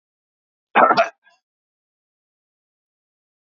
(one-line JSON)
{"cough_length": "3.4 s", "cough_amplitude": 27692, "cough_signal_mean_std_ratio": 0.22, "survey_phase": "beta (2021-08-13 to 2022-03-07)", "age": "45-64", "gender": "Male", "wearing_mask": "No", "symptom_none": true, "smoker_status": "Never smoked", "respiratory_condition_asthma": false, "respiratory_condition_other": false, "recruitment_source": "REACT", "submission_delay": "3 days", "covid_test_result": "Negative", "covid_test_method": "RT-qPCR", "influenza_a_test_result": "Negative", "influenza_b_test_result": "Negative"}